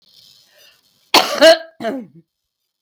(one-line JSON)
{"cough_length": "2.8 s", "cough_amplitude": 32768, "cough_signal_mean_std_ratio": 0.32, "survey_phase": "beta (2021-08-13 to 2022-03-07)", "age": "65+", "gender": "Female", "wearing_mask": "No", "symptom_cough_any": true, "symptom_shortness_of_breath": true, "symptom_onset": "8 days", "smoker_status": "Current smoker (1 to 10 cigarettes per day)", "respiratory_condition_asthma": false, "respiratory_condition_other": false, "recruitment_source": "REACT", "submission_delay": "1 day", "covid_test_result": "Negative", "covid_test_method": "RT-qPCR"}